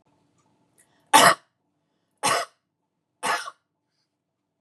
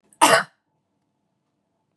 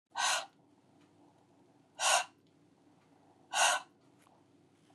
{
  "three_cough_length": "4.6 s",
  "three_cough_amplitude": 28614,
  "three_cough_signal_mean_std_ratio": 0.25,
  "cough_length": "2.0 s",
  "cough_amplitude": 28708,
  "cough_signal_mean_std_ratio": 0.25,
  "exhalation_length": "4.9 s",
  "exhalation_amplitude": 6171,
  "exhalation_signal_mean_std_ratio": 0.34,
  "survey_phase": "beta (2021-08-13 to 2022-03-07)",
  "age": "45-64",
  "gender": "Female",
  "wearing_mask": "No",
  "symptom_cough_any": true,
  "smoker_status": "Current smoker (1 to 10 cigarettes per day)",
  "respiratory_condition_asthma": false,
  "respiratory_condition_other": false,
  "recruitment_source": "REACT",
  "submission_delay": "1 day",
  "covid_test_result": "Negative",
  "covid_test_method": "RT-qPCR",
  "influenza_a_test_result": "Negative",
  "influenza_b_test_result": "Negative"
}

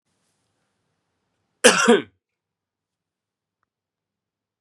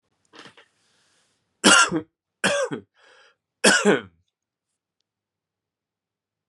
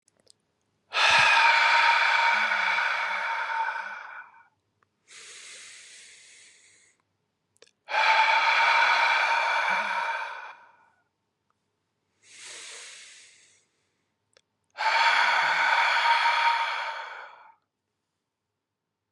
{
  "cough_length": "4.6 s",
  "cough_amplitude": 32767,
  "cough_signal_mean_std_ratio": 0.2,
  "three_cough_length": "6.5 s",
  "three_cough_amplitude": 29455,
  "three_cough_signal_mean_std_ratio": 0.29,
  "exhalation_length": "19.1 s",
  "exhalation_amplitude": 13723,
  "exhalation_signal_mean_std_ratio": 0.56,
  "survey_phase": "beta (2021-08-13 to 2022-03-07)",
  "age": "18-44",
  "gender": "Male",
  "wearing_mask": "No",
  "symptom_runny_or_blocked_nose": true,
  "smoker_status": "Never smoked",
  "respiratory_condition_asthma": false,
  "respiratory_condition_other": false,
  "recruitment_source": "Test and Trace",
  "submission_delay": "-1 day",
  "covid_test_result": "Positive",
  "covid_test_method": "LFT"
}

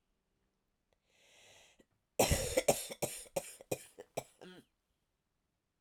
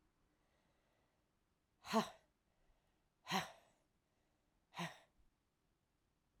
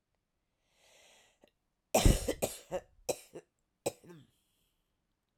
{
  "cough_length": "5.8 s",
  "cough_amplitude": 5168,
  "cough_signal_mean_std_ratio": 0.29,
  "exhalation_length": "6.4 s",
  "exhalation_amplitude": 1858,
  "exhalation_signal_mean_std_ratio": 0.22,
  "three_cough_length": "5.4 s",
  "three_cough_amplitude": 8956,
  "three_cough_signal_mean_std_ratio": 0.24,
  "survey_phase": "alpha (2021-03-01 to 2021-08-12)",
  "age": "45-64",
  "gender": "Female",
  "wearing_mask": "No",
  "symptom_cough_any": true,
  "symptom_new_continuous_cough": true,
  "symptom_fatigue": true,
  "symptom_fever_high_temperature": true,
  "symptom_change_to_sense_of_smell_or_taste": true,
  "smoker_status": "Never smoked",
  "respiratory_condition_asthma": false,
  "respiratory_condition_other": false,
  "recruitment_source": "Test and Trace",
  "submission_delay": "2 days",
  "covid_test_result": "Positive",
  "covid_test_method": "LFT"
}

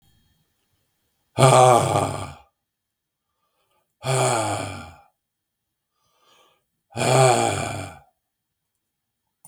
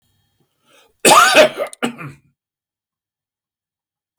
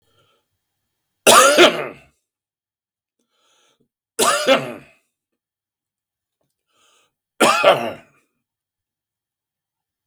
{
  "exhalation_length": "9.5 s",
  "exhalation_amplitude": 32766,
  "exhalation_signal_mean_std_ratio": 0.36,
  "cough_length": "4.2 s",
  "cough_amplitude": 32768,
  "cough_signal_mean_std_ratio": 0.31,
  "three_cough_length": "10.1 s",
  "three_cough_amplitude": 32768,
  "three_cough_signal_mean_std_ratio": 0.29,
  "survey_phase": "beta (2021-08-13 to 2022-03-07)",
  "age": "65+",
  "gender": "Male",
  "wearing_mask": "No",
  "symptom_cough_any": true,
  "symptom_shortness_of_breath": true,
  "symptom_fatigue": true,
  "symptom_change_to_sense_of_smell_or_taste": true,
  "smoker_status": "Ex-smoker",
  "respiratory_condition_asthma": false,
  "respiratory_condition_other": false,
  "recruitment_source": "REACT",
  "submission_delay": "3 days",
  "covid_test_result": "Negative",
  "covid_test_method": "RT-qPCR",
  "influenza_a_test_result": "Negative",
  "influenza_b_test_result": "Negative"
}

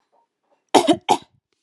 {
  "cough_length": "1.6 s",
  "cough_amplitude": 32767,
  "cough_signal_mean_std_ratio": 0.3,
  "survey_phase": "beta (2021-08-13 to 2022-03-07)",
  "age": "18-44",
  "gender": "Female",
  "wearing_mask": "No",
  "symptom_none": true,
  "smoker_status": "Never smoked",
  "respiratory_condition_asthma": false,
  "respiratory_condition_other": false,
  "recruitment_source": "REACT",
  "submission_delay": "0 days",
  "covid_test_result": "Negative",
  "covid_test_method": "RT-qPCR",
  "influenza_a_test_result": "Negative",
  "influenza_b_test_result": "Negative"
}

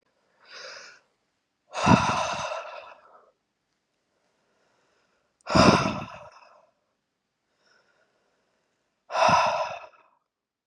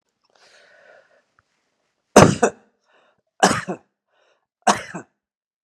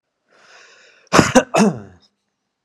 {
  "exhalation_length": "10.7 s",
  "exhalation_amplitude": 21967,
  "exhalation_signal_mean_std_ratio": 0.32,
  "three_cough_length": "5.6 s",
  "three_cough_amplitude": 32768,
  "three_cough_signal_mean_std_ratio": 0.23,
  "cough_length": "2.6 s",
  "cough_amplitude": 32768,
  "cough_signal_mean_std_ratio": 0.33,
  "survey_phase": "beta (2021-08-13 to 2022-03-07)",
  "age": "45-64",
  "gender": "Male",
  "wearing_mask": "No",
  "symptom_cough_any": true,
  "symptom_runny_or_blocked_nose": true,
  "symptom_change_to_sense_of_smell_or_taste": true,
  "symptom_onset": "7 days",
  "smoker_status": "Ex-smoker",
  "respiratory_condition_asthma": false,
  "respiratory_condition_other": false,
  "recruitment_source": "REACT",
  "submission_delay": "2 days",
  "covid_test_result": "Negative",
  "covid_test_method": "RT-qPCR"
}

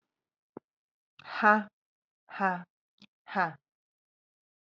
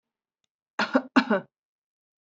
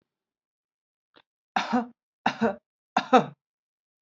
{
  "exhalation_length": "4.6 s",
  "exhalation_amplitude": 13482,
  "exhalation_signal_mean_std_ratio": 0.25,
  "cough_length": "2.2 s",
  "cough_amplitude": 15545,
  "cough_signal_mean_std_ratio": 0.29,
  "three_cough_length": "4.0 s",
  "three_cough_amplitude": 20527,
  "three_cough_signal_mean_std_ratio": 0.27,
  "survey_phase": "alpha (2021-03-01 to 2021-08-12)",
  "age": "45-64",
  "gender": "Female",
  "wearing_mask": "No",
  "symptom_none": true,
  "smoker_status": "Never smoked",
  "respiratory_condition_asthma": false,
  "respiratory_condition_other": false,
  "recruitment_source": "REACT",
  "submission_delay": "0 days",
  "covid_test_result": "Negative",
  "covid_test_method": "RT-qPCR"
}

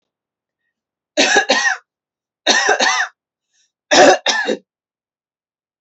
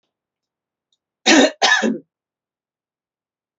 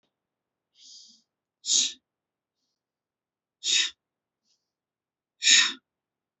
{
  "three_cough_length": "5.8 s",
  "three_cough_amplitude": 31501,
  "three_cough_signal_mean_std_ratio": 0.43,
  "cough_length": "3.6 s",
  "cough_amplitude": 32537,
  "cough_signal_mean_std_ratio": 0.31,
  "exhalation_length": "6.4 s",
  "exhalation_amplitude": 26266,
  "exhalation_signal_mean_std_ratio": 0.26,
  "survey_phase": "alpha (2021-03-01 to 2021-08-12)",
  "age": "18-44",
  "gender": "Female",
  "wearing_mask": "No",
  "symptom_fatigue": true,
  "symptom_onset": "13 days",
  "smoker_status": "Ex-smoker",
  "respiratory_condition_asthma": false,
  "respiratory_condition_other": false,
  "recruitment_source": "REACT",
  "submission_delay": "1 day",
  "covid_test_result": "Negative",
  "covid_test_method": "RT-qPCR"
}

